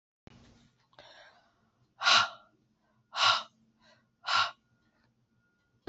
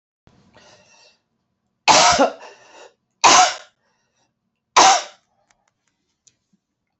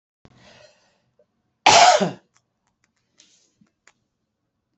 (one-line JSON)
{"exhalation_length": "5.9 s", "exhalation_amplitude": 9768, "exhalation_signal_mean_std_ratio": 0.28, "three_cough_length": "7.0 s", "three_cough_amplitude": 32768, "three_cough_signal_mean_std_ratio": 0.3, "cough_length": "4.8 s", "cough_amplitude": 29012, "cough_signal_mean_std_ratio": 0.24, "survey_phase": "beta (2021-08-13 to 2022-03-07)", "age": "45-64", "gender": "Female", "wearing_mask": "No", "symptom_cough_any": true, "symptom_runny_or_blocked_nose": true, "symptom_sore_throat": true, "symptom_fatigue": true, "symptom_headache": true, "symptom_onset": "3 days", "smoker_status": "Never smoked", "respiratory_condition_asthma": false, "respiratory_condition_other": false, "recruitment_source": "Test and Trace", "submission_delay": "2 days", "covid_test_result": "Positive", "covid_test_method": "RT-qPCR", "covid_ct_value": 33.2, "covid_ct_gene": "ORF1ab gene"}